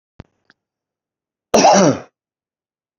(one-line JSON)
{"cough_length": "3.0 s", "cough_amplitude": 28506, "cough_signal_mean_std_ratio": 0.31, "survey_phase": "beta (2021-08-13 to 2022-03-07)", "age": "65+", "gender": "Male", "wearing_mask": "No", "symptom_cough_any": true, "symptom_fever_high_temperature": true, "symptom_headache": true, "symptom_onset": "4 days", "smoker_status": "Ex-smoker", "respiratory_condition_asthma": false, "respiratory_condition_other": false, "recruitment_source": "Test and Trace", "submission_delay": "2 days", "covid_test_result": "Positive", "covid_test_method": "RT-qPCR", "covid_ct_value": 12.7, "covid_ct_gene": "ORF1ab gene", "covid_ct_mean": 13.2, "covid_viral_load": "47000000 copies/ml", "covid_viral_load_category": "High viral load (>1M copies/ml)"}